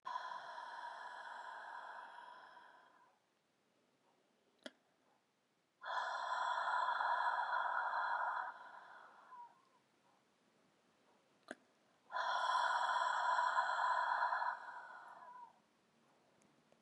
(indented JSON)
{
  "exhalation_length": "16.8 s",
  "exhalation_amplitude": 2152,
  "exhalation_signal_mean_std_ratio": 0.58,
  "survey_phase": "beta (2021-08-13 to 2022-03-07)",
  "age": "18-44",
  "gender": "Female",
  "wearing_mask": "No",
  "symptom_none": true,
  "smoker_status": "Ex-smoker",
  "respiratory_condition_asthma": false,
  "respiratory_condition_other": false,
  "recruitment_source": "REACT",
  "submission_delay": "4 days",
  "covid_test_result": "Negative",
  "covid_test_method": "RT-qPCR",
  "influenza_a_test_result": "Negative",
  "influenza_b_test_result": "Negative"
}